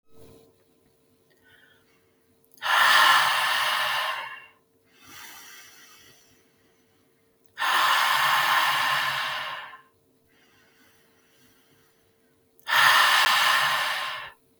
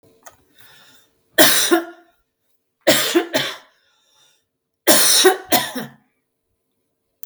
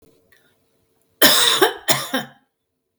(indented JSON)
{
  "exhalation_length": "14.6 s",
  "exhalation_amplitude": 20904,
  "exhalation_signal_mean_std_ratio": 0.51,
  "three_cough_length": "7.3 s",
  "three_cough_amplitude": 32768,
  "three_cough_signal_mean_std_ratio": 0.39,
  "cough_length": "3.0 s",
  "cough_amplitude": 32768,
  "cough_signal_mean_std_ratio": 0.39,
  "survey_phase": "beta (2021-08-13 to 2022-03-07)",
  "age": "45-64",
  "gender": "Female",
  "wearing_mask": "No",
  "symptom_sore_throat": true,
  "symptom_fatigue": true,
  "smoker_status": "Never smoked",
  "respiratory_condition_asthma": false,
  "respiratory_condition_other": false,
  "recruitment_source": "REACT",
  "submission_delay": "0 days",
  "covid_test_result": "Negative",
  "covid_test_method": "RT-qPCR"
}